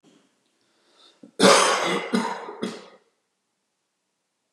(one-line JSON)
{"cough_length": "4.5 s", "cough_amplitude": 25770, "cough_signal_mean_std_ratio": 0.35, "survey_phase": "beta (2021-08-13 to 2022-03-07)", "age": "45-64", "gender": "Male", "wearing_mask": "No", "symptom_none": true, "smoker_status": "Never smoked", "respiratory_condition_asthma": false, "respiratory_condition_other": false, "recruitment_source": "REACT", "submission_delay": "2 days", "covid_test_result": "Negative", "covid_test_method": "RT-qPCR", "influenza_a_test_result": "Negative", "influenza_b_test_result": "Negative"}